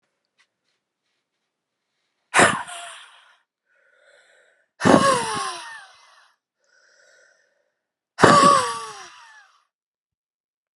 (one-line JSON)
{"exhalation_length": "10.8 s", "exhalation_amplitude": 32768, "exhalation_signal_mean_std_ratio": 0.29, "survey_phase": "beta (2021-08-13 to 2022-03-07)", "age": "45-64", "gender": "Female", "wearing_mask": "No", "symptom_runny_or_blocked_nose": true, "symptom_sore_throat": true, "symptom_headache": true, "symptom_onset": "7 days", "smoker_status": "Never smoked", "respiratory_condition_asthma": false, "respiratory_condition_other": false, "recruitment_source": "Test and Trace", "submission_delay": "2 days", "covid_test_result": "Positive", "covid_test_method": "RT-qPCR", "covid_ct_value": 15.2, "covid_ct_gene": "N gene", "covid_ct_mean": 16.1, "covid_viral_load": "5100000 copies/ml", "covid_viral_load_category": "High viral load (>1M copies/ml)"}